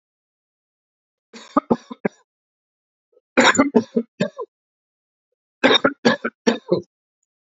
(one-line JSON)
{"three_cough_length": "7.4 s", "three_cough_amplitude": 27675, "three_cough_signal_mean_std_ratio": 0.3, "survey_phase": "alpha (2021-03-01 to 2021-08-12)", "age": "45-64", "gender": "Male", "wearing_mask": "No", "symptom_cough_any": true, "symptom_new_continuous_cough": true, "symptom_fatigue": true, "symptom_onset": "3 days", "smoker_status": "Current smoker (e-cigarettes or vapes only)", "respiratory_condition_asthma": false, "respiratory_condition_other": false, "recruitment_source": "Test and Trace", "submission_delay": "2 days", "covid_test_result": "Positive", "covid_test_method": "RT-qPCR", "covid_ct_value": 16.3, "covid_ct_gene": "N gene", "covid_ct_mean": 16.5, "covid_viral_load": "3800000 copies/ml", "covid_viral_load_category": "High viral load (>1M copies/ml)"}